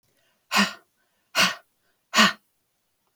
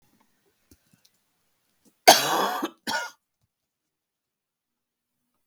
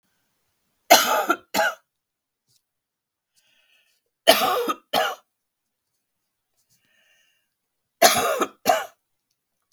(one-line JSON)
{"exhalation_length": "3.2 s", "exhalation_amplitude": 23744, "exhalation_signal_mean_std_ratio": 0.31, "cough_length": "5.5 s", "cough_amplitude": 32768, "cough_signal_mean_std_ratio": 0.22, "three_cough_length": "9.7 s", "three_cough_amplitude": 32768, "three_cough_signal_mean_std_ratio": 0.31, "survey_phase": "beta (2021-08-13 to 2022-03-07)", "age": "45-64", "gender": "Female", "wearing_mask": "No", "symptom_cough_any": true, "smoker_status": "Never smoked", "respiratory_condition_asthma": false, "respiratory_condition_other": false, "recruitment_source": "REACT", "submission_delay": "1 day", "covid_test_result": "Negative", "covid_test_method": "RT-qPCR", "influenza_a_test_result": "Negative", "influenza_b_test_result": "Negative"}